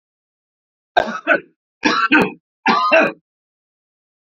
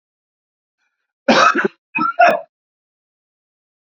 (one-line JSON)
{"three_cough_length": "4.4 s", "three_cough_amplitude": 32767, "three_cough_signal_mean_std_ratio": 0.41, "cough_length": "3.9 s", "cough_amplitude": 28571, "cough_signal_mean_std_ratio": 0.34, "survey_phase": "beta (2021-08-13 to 2022-03-07)", "age": "45-64", "gender": "Male", "wearing_mask": "No", "symptom_none": true, "smoker_status": "Ex-smoker", "respiratory_condition_asthma": false, "respiratory_condition_other": false, "recruitment_source": "REACT", "submission_delay": "3 days", "covid_test_result": "Negative", "covid_test_method": "RT-qPCR", "influenza_a_test_result": "Unknown/Void", "influenza_b_test_result": "Unknown/Void"}